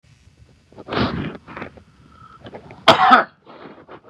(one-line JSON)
{"cough_length": "4.1 s", "cough_amplitude": 32768, "cough_signal_mean_std_ratio": 0.33, "survey_phase": "beta (2021-08-13 to 2022-03-07)", "age": "45-64", "gender": "Male", "wearing_mask": "No", "symptom_none": true, "symptom_onset": "3 days", "smoker_status": "Never smoked", "respiratory_condition_asthma": false, "respiratory_condition_other": false, "recruitment_source": "REACT", "submission_delay": "1 day", "covid_test_result": "Negative", "covid_test_method": "RT-qPCR", "influenza_a_test_result": "Negative", "influenza_b_test_result": "Negative"}